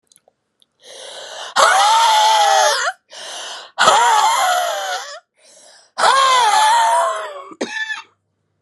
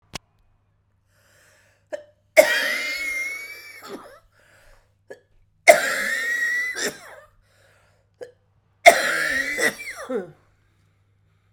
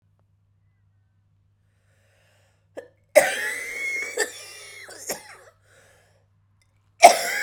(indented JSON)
{
  "exhalation_length": "8.6 s",
  "exhalation_amplitude": 32768,
  "exhalation_signal_mean_std_ratio": 0.68,
  "three_cough_length": "11.5 s",
  "three_cough_amplitude": 32768,
  "three_cough_signal_mean_std_ratio": 0.35,
  "cough_length": "7.4 s",
  "cough_amplitude": 32768,
  "cough_signal_mean_std_ratio": 0.25,
  "survey_phase": "beta (2021-08-13 to 2022-03-07)",
  "age": "45-64",
  "gender": "Female",
  "wearing_mask": "No",
  "symptom_cough_any": true,
  "symptom_headache": true,
  "symptom_change_to_sense_of_smell_or_taste": true,
  "symptom_loss_of_taste": true,
  "symptom_onset": "4 days",
  "smoker_status": "Ex-smoker",
  "respiratory_condition_asthma": true,
  "respiratory_condition_other": false,
  "recruitment_source": "Test and Trace",
  "submission_delay": "3 days",
  "covid_test_result": "Positive",
  "covid_test_method": "RT-qPCR",
  "covid_ct_value": 18.3,
  "covid_ct_gene": "ORF1ab gene",
  "covid_ct_mean": 18.8,
  "covid_viral_load": "700000 copies/ml",
  "covid_viral_load_category": "Low viral load (10K-1M copies/ml)"
}